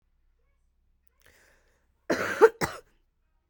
cough_length: 3.5 s
cough_amplitude: 21449
cough_signal_mean_std_ratio: 0.22
survey_phase: alpha (2021-03-01 to 2021-08-12)
age: 18-44
gender: Female
wearing_mask: 'No'
symptom_cough_any: true
symptom_new_continuous_cough: true
symptom_diarrhoea: true
symptom_fatigue: true
symptom_headache: true
symptom_change_to_sense_of_smell_or_taste: true
symptom_onset: 5 days
smoker_status: Ex-smoker
respiratory_condition_asthma: false
respiratory_condition_other: false
recruitment_source: Test and Trace
submission_delay: 1 day
covid_test_result: Positive
covid_test_method: RT-qPCR
covid_ct_value: 11.9
covid_ct_gene: ORF1ab gene
covid_ct_mean: 12.2
covid_viral_load: 97000000 copies/ml
covid_viral_load_category: High viral load (>1M copies/ml)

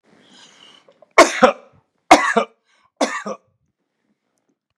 three_cough_length: 4.8 s
three_cough_amplitude: 32768
three_cough_signal_mean_std_ratio: 0.27
survey_phase: beta (2021-08-13 to 2022-03-07)
age: 65+
gender: Male
wearing_mask: 'No'
symptom_none: true
smoker_status: Ex-smoker
respiratory_condition_asthma: false
respiratory_condition_other: false
recruitment_source: REACT
submission_delay: 1 day
covid_test_result: Negative
covid_test_method: RT-qPCR
influenza_a_test_result: Negative
influenza_b_test_result: Negative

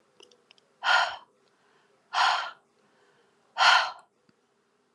exhalation_length: 4.9 s
exhalation_amplitude: 14421
exhalation_signal_mean_std_ratio: 0.34
survey_phase: alpha (2021-03-01 to 2021-08-12)
age: 18-44
gender: Female
wearing_mask: 'No'
symptom_none: true
smoker_status: Never smoked
respiratory_condition_asthma: false
respiratory_condition_other: false
recruitment_source: REACT
submission_delay: 1 day
covid_test_result: Negative
covid_test_method: RT-qPCR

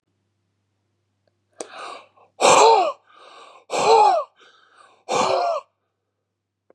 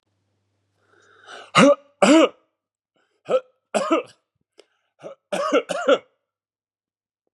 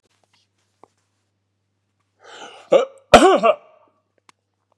exhalation_length: 6.7 s
exhalation_amplitude: 27636
exhalation_signal_mean_std_ratio: 0.39
three_cough_length: 7.3 s
three_cough_amplitude: 30326
three_cough_signal_mean_std_ratio: 0.33
cough_length: 4.8 s
cough_amplitude: 32768
cough_signal_mean_std_ratio: 0.25
survey_phase: beta (2021-08-13 to 2022-03-07)
age: 45-64
gender: Male
wearing_mask: 'No'
symptom_none: true
smoker_status: Never smoked
respiratory_condition_asthma: true
respiratory_condition_other: false
recruitment_source: REACT
submission_delay: 2 days
covid_test_result: Negative
covid_test_method: RT-qPCR
influenza_a_test_result: Negative
influenza_b_test_result: Negative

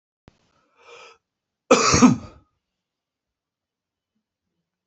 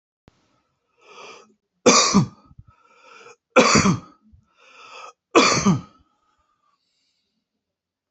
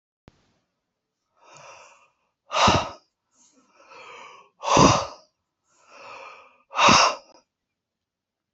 cough_length: 4.9 s
cough_amplitude: 25810
cough_signal_mean_std_ratio: 0.24
three_cough_length: 8.1 s
three_cough_amplitude: 28032
three_cough_signal_mean_std_ratio: 0.32
exhalation_length: 8.5 s
exhalation_amplitude: 24507
exhalation_signal_mean_std_ratio: 0.3
survey_phase: alpha (2021-03-01 to 2021-08-12)
age: 65+
gender: Male
wearing_mask: 'No'
symptom_none: true
smoker_status: Ex-smoker
respiratory_condition_asthma: false
respiratory_condition_other: false
recruitment_source: REACT
submission_delay: 1 day
covid_test_result: Negative
covid_test_method: RT-qPCR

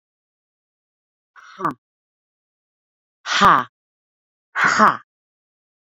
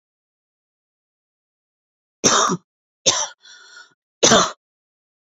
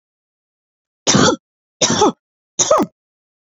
exhalation_length: 6.0 s
exhalation_amplitude: 29070
exhalation_signal_mean_std_ratio: 0.27
cough_length: 5.2 s
cough_amplitude: 32767
cough_signal_mean_std_ratio: 0.3
three_cough_length: 3.5 s
three_cough_amplitude: 32767
three_cough_signal_mean_std_ratio: 0.39
survey_phase: beta (2021-08-13 to 2022-03-07)
age: 18-44
gender: Female
wearing_mask: 'No'
symptom_runny_or_blocked_nose: true
symptom_onset: 7 days
smoker_status: Never smoked
respiratory_condition_asthma: false
respiratory_condition_other: false
recruitment_source: REACT
submission_delay: 1 day
covid_test_result: Negative
covid_test_method: RT-qPCR
influenza_a_test_result: Negative
influenza_b_test_result: Negative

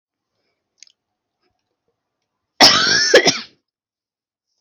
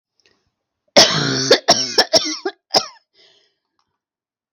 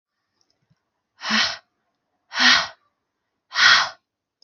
cough_length: 4.6 s
cough_amplitude: 32768
cough_signal_mean_std_ratio: 0.3
three_cough_length: 4.5 s
three_cough_amplitude: 32768
three_cough_signal_mean_std_ratio: 0.38
exhalation_length: 4.4 s
exhalation_amplitude: 30448
exhalation_signal_mean_std_ratio: 0.35
survey_phase: beta (2021-08-13 to 2022-03-07)
age: 18-44
gender: Female
wearing_mask: 'No'
symptom_runny_or_blocked_nose: true
symptom_headache: true
smoker_status: Never smoked
respiratory_condition_asthma: false
respiratory_condition_other: false
recruitment_source: REACT
submission_delay: 1 day
covid_test_method: RT-qPCR
influenza_a_test_result: Negative
influenza_b_test_result: Negative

